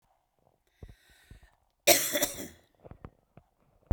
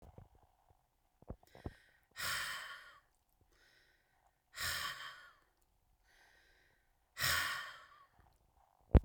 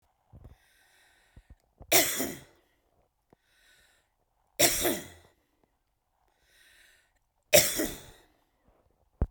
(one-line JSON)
{"cough_length": "3.9 s", "cough_amplitude": 17233, "cough_signal_mean_std_ratio": 0.26, "exhalation_length": "9.0 s", "exhalation_amplitude": 7068, "exhalation_signal_mean_std_ratio": 0.26, "three_cough_length": "9.3 s", "three_cough_amplitude": 21319, "three_cough_signal_mean_std_ratio": 0.26, "survey_phase": "beta (2021-08-13 to 2022-03-07)", "age": "65+", "gender": "Female", "wearing_mask": "No", "symptom_none": true, "smoker_status": "Ex-smoker", "respiratory_condition_asthma": false, "respiratory_condition_other": false, "recruitment_source": "REACT", "submission_delay": "2 days", "covid_test_result": "Negative", "covid_test_method": "RT-qPCR", "influenza_a_test_result": "Negative", "influenza_b_test_result": "Negative"}